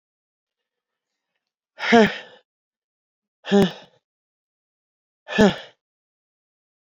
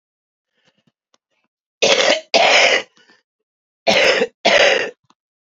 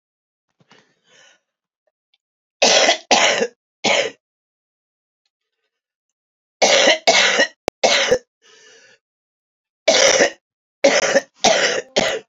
exhalation_length: 6.8 s
exhalation_amplitude: 26813
exhalation_signal_mean_std_ratio: 0.24
cough_length: 5.5 s
cough_amplitude: 30604
cough_signal_mean_std_ratio: 0.46
three_cough_length: 12.3 s
three_cough_amplitude: 32768
three_cough_signal_mean_std_ratio: 0.43
survey_phase: beta (2021-08-13 to 2022-03-07)
age: 45-64
gender: Female
wearing_mask: 'No'
symptom_cough_any: true
symptom_runny_or_blocked_nose: true
symptom_shortness_of_breath: true
symptom_sore_throat: true
symptom_abdominal_pain: true
symptom_fatigue: true
symptom_fever_high_temperature: true
symptom_headache: true
symptom_change_to_sense_of_smell_or_taste: true
symptom_loss_of_taste: true
symptom_onset: 8 days
smoker_status: Current smoker (1 to 10 cigarettes per day)
respiratory_condition_asthma: false
respiratory_condition_other: false
recruitment_source: Test and Trace
submission_delay: 2 days
covid_test_result: Positive
covid_test_method: RT-qPCR
covid_ct_value: 14.1
covid_ct_gene: S gene
covid_ct_mean: 14.1
covid_viral_load: 23000000 copies/ml
covid_viral_load_category: High viral load (>1M copies/ml)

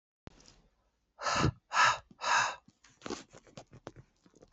exhalation_length: 4.5 s
exhalation_amplitude: 6412
exhalation_signal_mean_std_ratio: 0.37
survey_phase: beta (2021-08-13 to 2022-03-07)
age: 18-44
gender: Female
wearing_mask: 'No'
symptom_cough_any: true
symptom_runny_or_blocked_nose: true
symptom_shortness_of_breath: true
symptom_fatigue: true
symptom_headache: true
symptom_change_to_sense_of_smell_or_taste: true
symptom_loss_of_taste: true
symptom_onset: 3 days
smoker_status: Ex-smoker
respiratory_condition_asthma: true
respiratory_condition_other: false
recruitment_source: Test and Trace
submission_delay: 2 days
covid_test_result: Positive
covid_test_method: RT-qPCR
covid_ct_value: 16.6
covid_ct_gene: ORF1ab gene
covid_ct_mean: 17.1
covid_viral_load: 2400000 copies/ml
covid_viral_load_category: High viral load (>1M copies/ml)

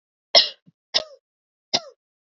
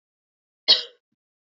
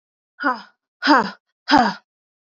three_cough_length: 2.4 s
three_cough_amplitude: 30868
three_cough_signal_mean_std_ratio: 0.23
cough_length: 1.5 s
cough_amplitude: 25996
cough_signal_mean_std_ratio: 0.21
exhalation_length: 2.5 s
exhalation_amplitude: 28035
exhalation_signal_mean_std_ratio: 0.37
survey_phase: beta (2021-08-13 to 2022-03-07)
age: 18-44
gender: Female
wearing_mask: 'No'
symptom_cough_any: true
symptom_runny_or_blocked_nose: true
symptom_sore_throat: true
symptom_fatigue: true
smoker_status: Never smoked
respiratory_condition_asthma: false
respiratory_condition_other: false
recruitment_source: Test and Trace
submission_delay: 1 day
covid_test_result: Positive
covid_test_method: LFT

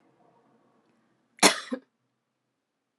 cough_length: 3.0 s
cough_amplitude: 23348
cough_signal_mean_std_ratio: 0.18
survey_phase: alpha (2021-03-01 to 2021-08-12)
age: 18-44
gender: Female
wearing_mask: 'No'
symptom_cough_any: true
symptom_fatigue: true
symptom_headache: true
symptom_onset: 2 days
smoker_status: Never smoked
respiratory_condition_asthma: false
respiratory_condition_other: false
recruitment_source: Test and Trace
submission_delay: 2 days
covid_test_result: Positive
covid_test_method: RT-qPCR
covid_ct_value: 26.8
covid_ct_gene: N gene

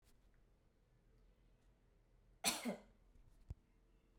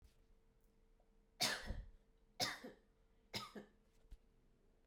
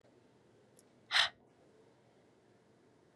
cough_length: 4.2 s
cough_amplitude: 2450
cough_signal_mean_std_ratio: 0.29
three_cough_length: 4.9 s
three_cough_amplitude: 2079
three_cough_signal_mean_std_ratio: 0.37
exhalation_length: 3.2 s
exhalation_amplitude: 6519
exhalation_signal_mean_std_ratio: 0.22
survey_phase: beta (2021-08-13 to 2022-03-07)
age: 18-44
gender: Female
wearing_mask: 'No'
symptom_fatigue: true
symptom_headache: true
symptom_onset: 13 days
smoker_status: Never smoked
respiratory_condition_asthma: false
respiratory_condition_other: false
recruitment_source: REACT
submission_delay: 1 day
covid_test_result: Negative
covid_test_method: RT-qPCR
influenza_a_test_result: Negative
influenza_b_test_result: Negative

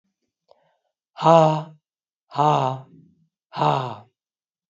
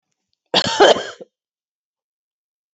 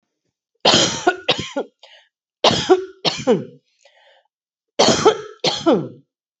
exhalation_length: 4.7 s
exhalation_amplitude: 26428
exhalation_signal_mean_std_ratio: 0.35
cough_length: 2.7 s
cough_amplitude: 28795
cough_signal_mean_std_ratio: 0.29
three_cough_length: 6.4 s
three_cough_amplitude: 32767
three_cough_signal_mean_std_ratio: 0.44
survey_phase: beta (2021-08-13 to 2022-03-07)
age: 45-64
gender: Female
wearing_mask: 'No'
symptom_cough_any: true
symptom_runny_or_blocked_nose: true
symptom_sore_throat: true
symptom_other: true
symptom_onset: 4 days
smoker_status: Never smoked
respiratory_condition_asthma: false
respiratory_condition_other: false
recruitment_source: Test and Trace
submission_delay: 2 days
covid_test_result: Positive
covid_test_method: RT-qPCR
covid_ct_value: 31.1
covid_ct_gene: ORF1ab gene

